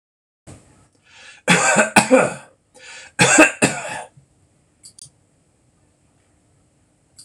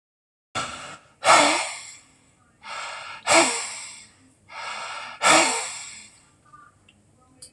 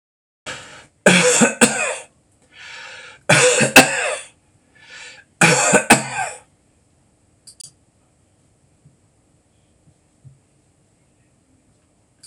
{
  "cough_length": "7.2 s",
  "cough_amplitude": 26028,
  "cough_signal_mean_std_ratio": 0.33,
  "exhalation_length": "7.5 s",
  "exhalation_amplitude": 24893,
  "exhalation_signal_mean_std_ratio": 0.4,
  "three_cough_length": "12.3 s",
  "three_cough_amplitude": 26028,
  "three_cough_signal_mean_std_ratio": 0.34,
  "survey_phase": "alpha (2021-03-01 to 2021-08-12)",
  "age": "65+",
  "gender": "Male",
  "wearing_mask": "No",
  "symptom_none": true,
  "smoker_status": "Ex-smoker",
  "respiratory_condition_asthma": false,
  "respiratory_condition_other": false,
  "recruitment_source": "REACT",
  "submission_delay": "2 days",
  "covid_test_result": "Negative",
  "covid_test_method": "RT-qPCR"
}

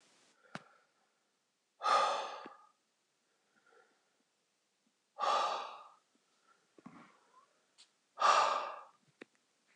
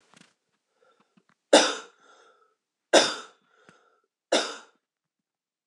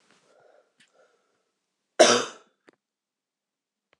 {
  "exhalation_length": "9.8 s",
  "exhalation_amplitude": 4967,
  "exhalation_signal_mean_std_ratio": 0.32,
  "three_cough_length": "5.7 s",
  "three_cough_amplitude": 23749,
  "three_cough_signal_mean_std_ratio": 0.23,
  "cough_length": "4.0 s",
  "cough_amplitude": 25000,
  "cough_signal_mean_std_ratio": 0.19,
  "survey_phase": "beta (2021-08-13 to 2022-03-07)",
  "age": "18-44",
  "gender": "Female",
  "wearing_mask": "No",
  "symptom_cough_any": true,
  "symptom_fatigue": true,
  "symptom_onset": "2 days",
  "smoker_status": "Never smoked",
  "respiratory_condition_asthma": false,
  "respiratory_condition_other": false,
  "recruitment_source": "Test and Trace",
  "submission_delay": "2 days",
  "covid_test_result": "Positive",
  "covid_test_method": "RT-qPCR",
  "covid_ct_value": 19.7,
  "covid_ct_gene": "N gene",
  "covid_ct_mean": 20.4,
  "covid_viral_load": "210000 copies/ml",
  "covid_viral_load_category": "Low viral load (10K-1M copies/ml)"
}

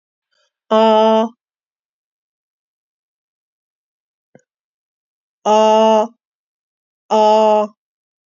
{
  "exhalation_length": "8.4 s",
  "exhalation_amplitude": 28410,
  "exhalation_signal_mean_std_ratio": 0.35,
  "survey_phase": "beta (2021-08-13 to 2022-03-07)",
  "age": "45-64",
  "gender": "Female",
  "wearing_mask": "No",
  "symptom_cough_any": true,
  "symptom_shortness_of_breath": true,
  "symptom_headache": true,
  "symptom_change_to_sense_of_smell_or_taste": true,
  "symptom_loss_of_taste": true,
  "smoker_status": "Ex-smoker",
  "respiratory_condition_asthma": false,
  "respiratory_condition_other": false,
  "recruitment_source": "Test and Trace",
  "submission_delay": "2 days",
  "covid_test_result": "Positive",
  "covid_test_method": "RT-qPCR",
  "covid_ct_value": 11.5,
  "covid_ct_gene": "N gene",
  "covid_ct_mean": 11.6,
  "covid_viral_load": "150000000 copies/ml",
  "covid_viral_load_category": "High viral load (>1M copies/ml)"
}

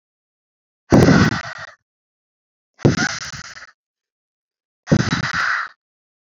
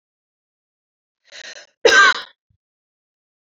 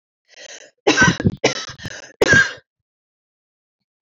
{
  "exhalation_length": "6.2 s",
  "exhalation_amplitude": 32768,
  "exhalation_signal_mean_std_ratio": 0.37,
  "cough_length": "3.5 s",
  "cough_amplitude": 29809,
  "cough_signal_mean_std_ratio": 0.25,
  "three_cough_length": "4.0 s",
  "three_cough_amplitude": 27467,
  "three_cough_signal_mean_std_ratio": 0.37,
  "survey_phase": "beta (2021-08-13 to 2022-03-07)",
  "age": "18-44",
  "gender": "Female",
  "wearing_mask": "No",
  "symptom_fatigue": true,
  "symptom_headache": true,
  "smoker_status": "Never smoked",
  "respiratory_condition_asthma": true,
  "respiratory_condition_other": false,
  "recruitment_source": "REACT",
  "submission_delay": "2 days",
  "covid_test_result": "Negative",
  "covid_test_method": "RT-qPCR",
  "influenza_a_test_result": "Negative",
  "influenza_b_test_result": "Negative"
}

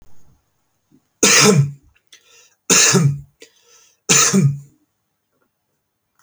{
  "three_cough_length": "6.2 s",
  "three_cough_amplitude": 32768,
  "three_cough_signal_mean_std_ratio": 0.41,
  "survey_phase": "beta (2021-08-13 to 2022-03-07)",
  "age": "18-44",
  "gender": "Male",
  "wearing_mask": "No",
  "symptom_none": true,
  "smoker_status": "Never smoked",
  "respiratory_condition_asthma": false,
  "respiratory_condition_other": false,
  "recruitment_source": "REACT",
  "submission_delay": "2 days",
  "covid_test_result": "Negative",
  "covid_test_method": "RT-qPCR"
}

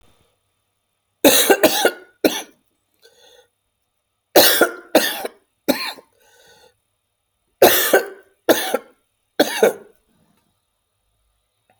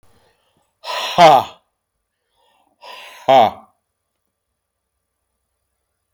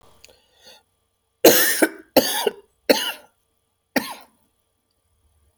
{
  "three_cough_length": "11.8 s",
  "three_cough_amplitude": 32768,
  "three_cough_signal_mean_std_ratio": 0.34,
  "exhalation_length": "6.1 s",
  "exhalation_amplitude": 32768,
  "exhalation_signal_mean_std_ratio": 0.26,
  "cough_length": "5.6 s",
  "cough_amplitude": 32768,
  "cough_signal_mean_std_ratio": 0.3,
  "survey_phase": "beta (2021-08-13 to 2022-03-07)",
  "age": "45-64",
  "gender": "Male",
  "wearing_mask": "No",
  "symptom_cough_any": true,
  "symptom_new_continuous_cough": true,
  "symptom_runny_or_blocked_nose": true,
  "symptom_diarrhoea": true,
  "symptom_fatigue": true,
  "symptom_fever_high_temperature": true,
  "symptom_headache": true,
  "symptom_change_to_sense_of_smell_or_taste": true,
  "symptom_loss_of_taste": true,
  "symptom_other": true,
  "symptom_onset": "4 days",
  "smoker_status": "Never smoked",
  "respiratory_condition_asthma": false,
  "respiratory_condition_other": false,
  "recruitment_source": "Test and Trace",
  "submission_delay": "2 days",
  "covid_test_result": "Positive",
  "covid_test_method": "RT-qPCR",
  "covid_ct_value": 22.0,
  "covid_ct_gene": "ORF1ab gene",
  "covid_ct_mean": 22.3,
  "covid_viral_load": "49000 copies/ml",
  "covid_viral_load_category": "Low viral load (10K-1M copies/ml)"
}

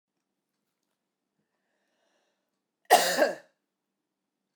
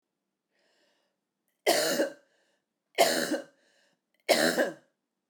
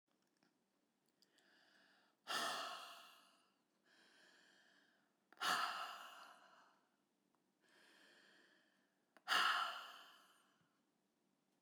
{
  "cough_length": "4.6 s",
  "cough_amplitude": 17942,
  "cough_signal_mean_std_ratio": 0.21,
  "three_cough_length": "5.3 s",
  "three_cough_amplitude": 12257,
  "three_cough_signal_mean_std_ratio": 0.38,
  "exhalation_length": "11.6 s",
  "exhalation_amplitude": 1977,
  "exhalation_signal_mean_std_ratio": 0.33,
  "survey_phase": "beta (2021-08-13 to 2022-03-07)",
  "age": "45-64",
  "gender": "Female",
  "wearing_mask": "No",
  "symptom_cough_any": true,
  "symptom_runny_or_blocked_nose": true,
  "symptom_sore_throat": true,
  "symptom_fatigue": true,
  "symptom_fever_high_temperature": true,
  "symptom_headache": true,
  "symptom_onset": "3 days",
  "smoker_status": "Never smoked",
  "respiratory_condition_asthma": false,
  "respiratory_condition_other": false,
  "recruitment_source": "Test and Trace",
  "submission_delay": "2 days",
  "covid_test_result": "Positive",
  "covid_test_method": "RT-qPCR",
  "covid_ct_value": 19.7,
  "covid_ct_gene": "ORF1ab gene",
  "covid_ct_mean": 20.4,
  "covid_viral_load": "200000 copies/ml",
  "covid_viral_load_category": "Low viral load (10K-1M copies/ml)"
}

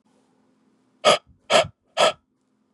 {
  "exhalation_length": "2.7 s",
  "exhalation_amplitude": 26877,
  "exhalation_signal_mean_std_ratio": 0.31,
  "survey_phase": "beta (2021-08-13 to 2022-03-07)",
  "age": "18-44",
  "gender": "Male",
  "wearing_mask": "No",
  "symptom_cough_any": true,
  "symptom_runny_or_blocked_nose": true,
  "symptom_sore_throat": true,
  "symptom_fatigue": true,
  "symptom_change_to_sense_of_smell_or_taste": true,
  "symptom_onset": "4 days",
  "smoker_status": "Never smoked",
  "respiratory_condition_asthma": false,
  "respiratory_condition_other": false,
  "recruitment_source": "Test and Trace",
  "submission_delay": "2 days",
  "covid_test_result": "Positive",
  "covid_test_method": "RT-qPCR",
  "covid_ct_value": 17.2,
  "covid_ct_gene": "N gene"
}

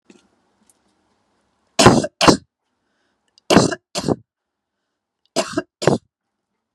{
  "three_cough_length": "6.7 s",
  "three_cough_amplitude": 32768,
  "three_cough_signal_mean_std_ratio": 0.28,
  "survey_phase": "beta (2021-08-13 to 2022-03-07)",
  "age": "45-64",
  "gender": "Female",
  "wearing_mask": "No",
  "symptom_none": true,
  "smoker_status": "Never smoked",
  "respiratory_condition_asthma": false,
  "respiratory_condition_other": false,
  "recruitment_source": "REACT",
  "submission_delay": "1 day",
  "covid_test_result": "Negative",
  "covid_test_method": "RT-qPCR"
}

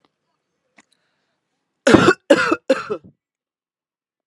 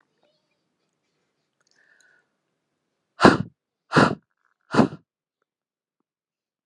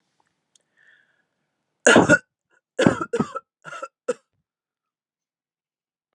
{
  "cough_length": "4.3 s",
  "cough_amplitude": 32768,
  "cough_signal_mean_std_ratio": 0.29,
  "exhalation_length": "6.7 s",
  "exhalation_amplitude": 32767,
  "exhalation_signal_mean_std_ratio": 0.2,
  "three_cough_length": "6.1 s",
  "three_cough_amplitude": 31543,
  "three_cough_signal_mean_std_ratio": 0.25,
  "survey_phase": "beta (2021-08-13 to 2022-03-07)",
  "age": "18-44",
  "gender": "Female",
  "wearing_mask": "No",
  "symptom_runny_or_blocked_nose": true,
  "smoker_status": "Never smoked",
  "respiratory_condition_asthma": false,
  "respiratory_condition_other": false,
  "recruitment_source": "REACT",
  "submission_delay": "4 days",
  "covid_test_result": "Negative",
  "covid_test_method": "RT-qPCR"
}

